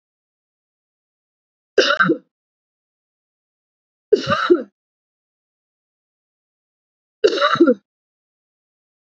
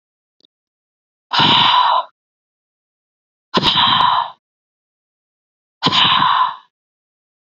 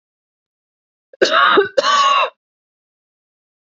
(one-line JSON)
{"three_cough_length": "9.0 s", "three_cough_amplitude": 27445, "three_cough_signal_mean_std_ratio": 0.27, "exhalation_length": "7.4 s", "exhalation_amplitude": 29579, "exhalation_signal_mean_std_ratio": 0.46, "cough_length": "3.8 s", "cough_amplitude": 29452, "cough_signal_mean_std_ratio": 0.42, "survey_phase": "beta (2021-08-13 to 2022-03-07)", "age": "18-44", "gender": "Female", "wearing_mask": "No", "symptom_none": true, "symptom_onset": "5 days", "smoker_status": "Ex-smoker", "respiratory_condition_asthma": false, "respiratory_condition_other": false, "recruitment_source": "REACT", "submission_delay": "1 day", "covid_test_result": "Negative", "covid_test_method": "RT-qPCR"}